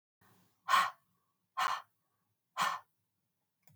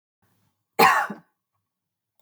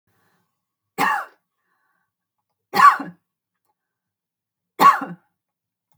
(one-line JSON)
{"exhalation_length": "3.8 s", "exhalation_amplitude": 5252, "exhalation_signal_mean_std_ratio": 0.32, "cough_length": "2.2 s", "cough_amplitude": 22261, "cough_signal_mean_std_ratio": 0.28, "three_cough_length": "6.0 s", "three_cough_amplitude": 31169, "three_cough_signal_mean_std_ratio": 0.24, "survey_phase": "beta (2021-08-13 to 2022-03-07)", "age": "45-64", "gender": "Female", "wearing_mask": "No", "symptom_fatigue": true, "symptom_onset": "4 days", "smoker_status": "Ex-smoker", "respiratory_condition_asthma": false, "respiratory_condition_other": false, "recruitment_source": "REACT", "submission_delay": "1 day", "covid_test_result": "Negative", "covid_test_method": "RT-qPCR", "influenza_a_test_result": "Negative", "influenza_b_test_result": "Negative"}